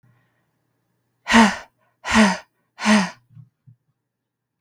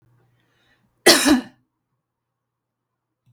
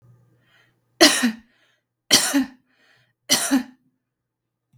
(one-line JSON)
{"exhalation_length": "4.6 s", "exhalation_amplitude": 32075, "exhalation_signal_mean_std_ratio": 0.33, "cough_length": "3.3 s", "cough_amplitude": 32768, "cough_signal_mean_std_ratio": 0.25, "three_cough_length": "4.8 s", "three_cough_amplitude": 32768, "three_cough_signal_mean_std_ratio": 0.33, "survey_phase": "beta (2021-08-13 to 2022-03-07)", "age": "18-44", "gender": "Female", "wearing_mask": "No", "symptom_none": true, "smoker_status": "Never smoked", "respiratory_condition_asthma": false, "respiratory_condition_other": false, "recruitment_source": "REACT", "submission_delay": "1 day", "covid_test_result": "Negative", "covid_test_method": "RT-qPCR"}